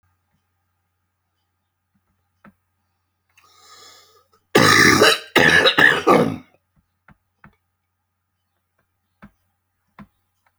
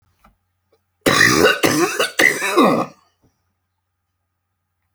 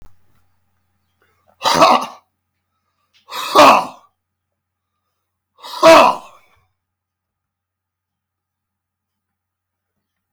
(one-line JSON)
{"cough_length": "10.6 s", "cough_amplitude": 32767, "cough_signal_mean_std_ratio": 0.3, "three_cough_length": "4.9 s", "three_cough_amplitude": 29664, "three_cough_signal_mean_std_ratio": 0.45, "exhalation_length": "10.3 s", "exhalation_amplitude": 32767, "exhalation_signal_mean_std_ratio": 0.27, "survey_phase": "alpha (2021-03-01 to 2021-08-12)", "age": "65+", "gender": "Male", "wearing_mask": "No", "symptom_none": true, "smoker_status": "Never smoked", "respiratory_condition_asthma": true, "respiratory_condition_other": false, "recruitment_source": "REACT", "submission_delay": "2 days", "covid_test_result": "Negative", "covid_test_method": "RT-qPCR"}